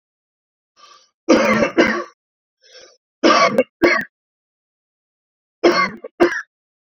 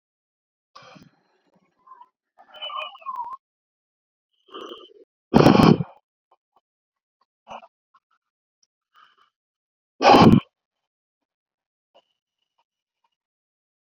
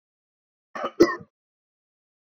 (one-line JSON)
{"three_cough_length": "7.0 s", "three_cough_amplitude": 28576, "three_cough_signal_mean_std_ratio": 0.39, "exhalation_length": "13.8 s", "exhalation_amplitude": 32767, "exhalation_signal_mean_std_ratio": 0.21, "cough_length": "2.3 s", "cough_amplitude": 22468, "cough_signal_mean_std_ratio": 0.21, "survey_phase": "beta (2021-08-13 to 2022-03-07)", "age": "18-44", "gender": "Male", "wearing_mask": "No", "symptom_none": true, "smoker_status": "Never smoked", "respiratory_condition_asthma": true, "respiratory_condition_other": false, "recruitment_source": "REACT", "submission_delay": "1 day", "covid_test_result": "Negative", "covid_test_method": "RT-qPCR"}